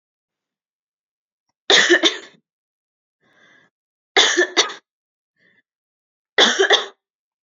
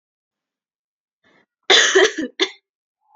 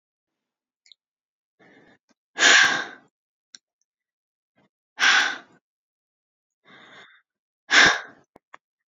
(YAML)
three_cough_length: 7.4 s
three_cough_amplitude: 30289
three_cough_signal_mean_std_ratio: 0.32
cough_length: 3.2 s
cough_amplitude: 32768
cough_signal_mean_std_ratio: 0.32
exhalation_length: 8.9 s
exhalation_amplitude: 25484
exhalation_signal_mean_std_ratio: 0.27
survey_phase: beta (2021-08-13 to 2022-03-07)
age: 18-44
gender: Female
wearing_mask: 'No'
symptom_none: true
smoker_status: Never smoked
respiratory_condition_asthma: false
respiratory_condition_other: false
recruitment_source: REACT
submission_delay: 2 days
covid_test_result: Negative
covid_test_method: RT-qPCR